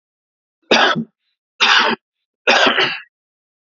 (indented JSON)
{
  "three_cough_length": "3.7 s",
  "three_cough_amplitude": 32005,
  "three_cough_signal_mean_std_ratio": 0.46,
  "survey_phase": "beta (2021-08-13 to 2022-03-07)",
  "age": "45-64",
  "gender": "Male",
  "wearing_mask": "No",
  "symptom_cough_any": true,
  "smoker_status": "Ex-smoker",
  "respiratory_condition_asthma": false,
  "respiratory_condition_other": false,
  "recruitment_source": "REACT",
  "submission_delay": "1 day",
  "covid_test_result": "Negative",
  "covid_test_method": "RT-qPCR"
}